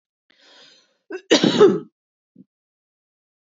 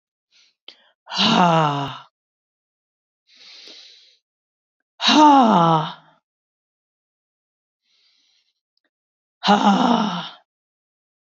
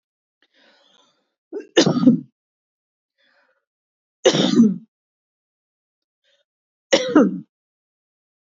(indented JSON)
{
  "cough_length": "3.5 s",
  "cough_amplitude": 26353,
  "cough_signal_mean_std_ratio": 0.28,
  "exhalation_length": "11.3 s",
  "exhalation_amplitude": 27803,
  "exhalation_signal_mean_std_ratio": 0.36,
  "three_cough_length": "8.4 s",
  "three_cough_amplitude": 32355,
  "three_cough_signal_mean_std_ratio": 0.3,
  "survey_phase": "beta (2021-08-13 to 2022-03-07)",
  "age": "45-64",
  "gender": "Female",
  "wearing_mask": "No",
  "symptom_runny_or_blocked_nose": true,
  "symptom_sore_throat": true,
  "symptom_diarrhoea": true,
  "symptom_fatigue": true,
  "symptom_headache": true,
  "symptom_other": true,
  "smoker_status": "Ex-smoker",
  "respiratory_condition_asthma": false,
  "respiratory_condition_other": false,
  "recruitment_source": "Test and Trace",
  "submission_delay": "2 days",
  "covid_test_result": "Positive",
  "covid_test_method": "LFT"
}